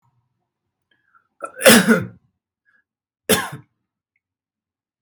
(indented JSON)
{
  "cough_length": "5.0 s",
  "cough_amplitude": 32768,
  "cough_signal_mean_std_ratio": 0.25,
  "survey_phase": "beta (2021-08-13 to 2022-03-07)",
  "age": "45-64",
  "gender": "Male",
  "wearing_mask": "No",
  "symptom_none": true,
  "smoker_status": "Ex-smoker",
  "respiratory_condition_asthma": false,
  "respiratory_condition_other": false,
  "recruitment_source": "REACT",
  "submission_delay": "19 days",
  "covid_test_result": "Negative",
  "covid_test_method": "RT-qPCR"
}